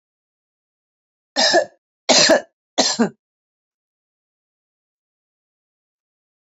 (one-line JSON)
{"three_cough_length": "6.5 s", "three_cough_amplitude": 30073, "three_cough_signal_mean_std_ratio": 0.28, "survey_phase": "beta (2021-08-13 to 2022-03-07)", "age": "65+", "gender": "Female", "wearing_mask": "No", "symptom_none": true, "smoker_status": "Ex-smoker", "respiratory_condition_asthma": false, "respiratory_condition_other": false, "recruitment_source": "REACT", "submission_delay": "2 days", "covid_test_result": "Negative", "covid_test_method": "RT-qPCR", "influenza_a_test_result": "Negative", "influenza_b_test_result": "Negative"}